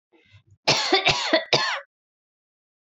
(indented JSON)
{
  "cough_length": "3.0 s",
  "cough_amplitude": 21851,
  "cough_signal_mean_std_ratio": 0.44,
  "survey_phase": "beta (2021-08-13 to 2022-03-07)",
  "age": "18-44",
  "gender": "Female",
  "wearing_mask": "No",
  "symptom_cough_any": true,
  "symptom_runny_or_blocked_nose": true,
  "symptom_sore_throat": true,
  "symptom_headache": true,
  "symptom_other": true,
  "symptom_onset": "7 days",
  "smoker_status": "Ex-smoker",
  "respiratory_condition_asthma": false,
  "respiratory_condition_other": false,
  "recruitment_source": "REACT",
  "submission_delay": "1 day",
  "covid_test_result": "Negative",
  "covid_test_method": "RT-qPCR",
  "influenza_a_test_result": "Unknown/Void",
  "influenza_b_test_result": "Unknown/Void"
}